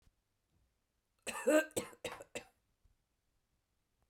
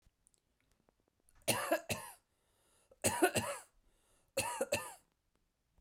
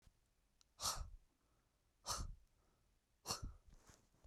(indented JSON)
{
  "cough_length": "4.1 s",
  "cough_amplitude": 4210,
  "cough_signal_mean_std_ratio": 0.25,
  "three_cough_length": "5.8 s",
  "three_cough_amplitude": 5110,
  "three_cough_signal_mean_std_ratio": 0.36,
  "exhalation_length": "4.3 s",
  "exhalation_amplitude": 1260,
  "exhalation_signal_mean_std_ratio": 0.39,
  "survey_phase": "beta (2021-08-13 to 2022-03-07)",
  "age": "18-44",
  "gender": "Female",
  "wearing_mask": "No",
  "symptom_none": true,
  "symptom_onset": "5 days",
  "smoker_status": "Never smoked",
  "respiratory_condition_asthma": true,
  "respiratory_condition_other": false,
  "recruitment_source": "REACT",
  "submission_delay": "1 day",
  "covid_test_result": "Negative",
  "covid_test_method": "RT-qPCR",
  "influenza_a_test_result": "Negative",
  "influenza_b_test_result": "Negative"
}